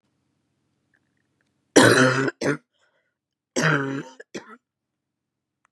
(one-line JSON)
{"cough_length": "5.7 s", "cough_amplitude": 32707, "cough_signal_mean_std_ratio": 0.33, "survey_phase": "beta (2021-08-13 to 2022-03-07)", "age": "18-44", "gender": "Female", "wearing_mask": "No", "symptom_cough_any": true, "symptom_runny_or_blocked_nose": true, "symptom_shortness_of_breath": true, "symptom_headache": true, "smoker_status": "Current smoker (e-cigarettes or vapes only)", "respiratory_condition_asthma": false, "respiratory_condition_other": false, "recruitment_source": "Test and Trace", "submission_delay": "2 days", "covid_test_result": "Positive", "covid_test_method": "RT-qPCR", "covid_ct_value": 16.0, "covid_ct_gene": "ORF1ab gene", "covid_ct_mean": 16.4, "covid_viral_load": "4100000 copies/ml", "covid_viral_load_category": "High viral load (>1M copies/ml)"}